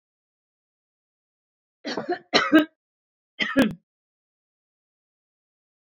{
  "cough_length": "5.9 s",
  "cough_amplitude": 21418,
  "cough_signal_mean_std_ratio": 0.26,
  "survey_phase": "beta (2021-08-13 to 2022-03-07)",
  "age": "45-64",
  "gender": "Female",
  "wearing_mask": "No",
  "symptom_new_continuous_cough": true,
  "symptom_other": true,
  "smoker_status": "Ex-smoker",
  "respiratory_condition_asthma": false,
  "respiratory_condition_other": false,
  "recruitment_source": "Test and Trace",
  "submission_delay": "2 days",
  "covid_test_result": "Positive",
  "covid_test_method": "RT-qPCR",
  "covid_ct_value": 29.8,
  "covid_ct_gene": "ORF1ab gene"
}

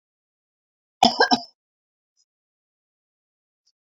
{
  "cough_length": "3.8 s",
  "cough_amplitude": 29331,
  "cough_signal_mean_std_ratio": 0.19,
  "survey_phase": "beta (2021-08-13 to 2022-03-07)",
  "age": "45-64",
  "gender": "Female",
  "wearing_mask": "No",
  "symptom_none": true,
  "smoker_status": "Current smoker (1 to 10 cigarettes per day)",
  "respiratory_condition_asthma": false,
  "respiratory_condition_other": false,
  "recruitment_source": "REACT",
  "submission_delay": "4 days",
  "covid_test_result": "Negative",
  "covid_test_method": "RT-qPCR"
}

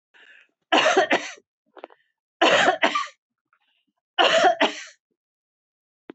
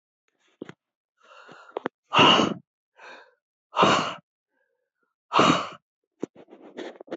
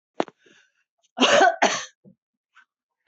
{
  "three_cough_length": "6.1 s",
  "three_cough_amplitude": 23041,
  "three_cough_signal_mean_std_ratio": 0.41,
  "exhalation_length": "7.2 s",
  "exhalation_amplitude": 19341,
  "exhalation_signal_mean_std_ratio": 0.33,
  "cough_length": "3.1 s",
  "cough_amplitude": 20585,
  "cough_signal_mean_std_ratio": 0.34,
  "survey_phase": "beta (2021-08-13 to 2022-03-07)",
  "age": "65+",
  "gender": "Female",
  "wearing_mask": "No",
  "symptom_none": true,
  "smoker_status": "Never smoked",
  "respiratory_condition_asthma": false,
  "respiratory_condition_other": false,
  "recruitment_source": "REACT",
  "submission_delay": "6 days",
  "covid_test_result": "Negative",
  "covid_test_method": "RT-qPCR"
}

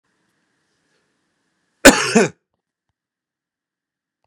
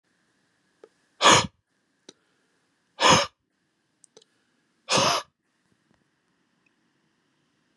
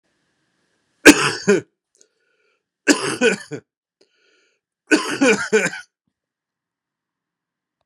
{
  "cough_length": "4.3 s",
  "cough_amplitude": 32768,
  "cough_signal_mean_std_ratio": 0.2,
  "exhalation_length": "7.8 s",
  "exhalation_amplitude": 24821,
  "exhalation_signal_mean_std_ratio": 0.24,
  "three_cough_length": "7.9 s",
  "three_cough_amplitude": 32768,
  "three_cough_signal_mean_std_ratio": 0.3,
  "survey_phase": "beta (2021-08-13 to 2022-03-07)",
  "age": "45-64",
  "gender": "Male",
  "wearing_mask": "No",
  "symptom_cough_any": true,
  "symptom_runny_or_blocked_nose": true,
  "symptom_sore_throat": true,
  "symptom_other": true,
  "smoker_status": "Never smoked",
  "respiratory_condition_asthma": false,
  "respiratory_condition_other": false,
  "recruitment_source": "Test and Trace",
  "submission_delay": "1 day",
  "covid_test_result": "Positive",
  "covid_test_method": "ePCR"
}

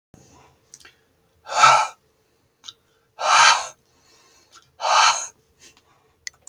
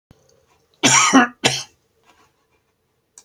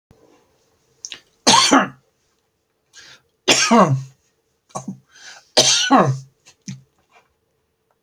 {
  "exhalation_length": "6.5 s",
  "exhalation_amplitude": 29420,
  "exhalation_signal_mean_std_ratio": 0.34,
  "cough_length": "3.2 s",
  "cough_amplitude": 30313,
  "cough_signal_mean_std_ratio": 0.34,
  "three_cough_length": "8.0 s",
  "three_cough_amplitude": 32768,
  "three_cough_signal_mean_std_ratio": 0.36,
  "survey_phase": "beta (2021-08-13 to 2022-03-07)",
  "age": "65+",
  "gender": "Male",
  "wearing_mask": "No",
  "symptom_none": true,
  "smoker_status": "Never smoked",
  "respiratory_condition_asthma": false,
  "respiratory_condition_other": false,
  "recruitment_source": "REACT",
  "submission_delay": "2 days",
  "covid_test_result": "Negative",
  "covid_test_method": "RT-qPCR",
  "influenza_a_test_result": "Negative",
  "influenza_b_test_result": "Negative"
}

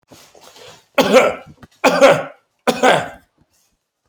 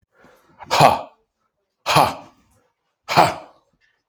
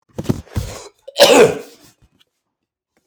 {
  "three_cough_length": "4.1 s",
  "three_cough_amplitude": 30711,
  "three_cough_signal_mean_std_ratio": 0.41,
  "exhalation_length": "4.1 s",
  "exhalation_amplitude": 31107,
  "exhalation_signal_mean_std_ratio": 0.33,
  "cough_length": "3.1 s",
  "cough_amplitude": 32768,
  "cough_signal_mean_std_ratio": 0.34,
  "survey_phase": "alpha (2021-03-01 to 2021-08-12)",
  "age": "45-64",
  "gender": "Male",
  "wearing_mask": "No",
  "symptom_none": true,
  "smoker_status": "Ex-smoker",
  "respiratory_condition_asthma": false,
  "respiratory_condition_other": false,
  "recruitment_source": "REACT",
  "submission_delay": "2 days",
  "covid_test_result": "Negative",
  "covid_test_method": "RT-qPCR"
}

